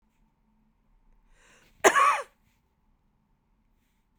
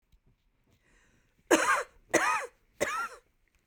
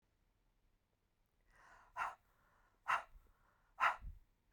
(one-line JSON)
{"cough_length": "4.2 s", "cough_amplitude": 22106, "cough_signal_mean_std_ratio": 0.23, "three_cough_length": "3.7 s", "three_cough_amplitude": 10726, "three_cough_signal_mean_std_ratio": 0.38, "exhalation_length": "4.5 s", "exhalation_amplitude": 2721, "exhalation_signal_mean_std_ratio": 0.27, "survey_phase": "beta (2021-08-13 to 2022-03-07)", "age": "45-64", "gender": "Female", "wearing_mask": "No", "symptom_none": true, "smoker_status": "Ex-smoker", "respiratory_condition_asthma": false, "respiratory_condition_other": false, "recruitment_source": "REACT", "submission_delay": "3 days", "covid_test_result": "Negative", "covid_test_method": "RT-qPCR", "influenza_a_test_result": "Unknown/Void", "influenza_b_test_result": "Unknown/Void"}